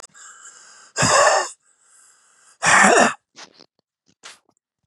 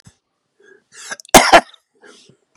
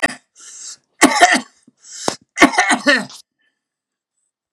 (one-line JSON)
{"exhalation_length": "4.9 s", "exhalation_amplitude": 31919, "exhalation_signal_mean_std_ratio": 0.38, "cough_length": "2.6 s", "cough_amplitude": 32768, "cough_signal_mean_std_ratio": 0.25, "three_cough_length": "4.5 s", "three_cough_amplitude": 32768, "three_cough_signal_mean_std_ratio": 0.37, "survey_phase": "beta (2021-08-13 to 2022-03-07)", "age": "45-64", "gender": "Male", "wearing_mask": "No", "symptom_diarrhoea": true, "symptom_fatigue": true, "smoker_status": "Ex-smoker", "respiratory_condition_asthma": true, "respiratory_condition_other": false, "recruitment_source": "REACT", "submission_delay": "1 day", "covid_test_result": "Negative", "covid_test_method": "RT-qPCR", "influenza_a_test_result": "Unknown/Void", "influenza_b_test_result": "Unknown/Void"}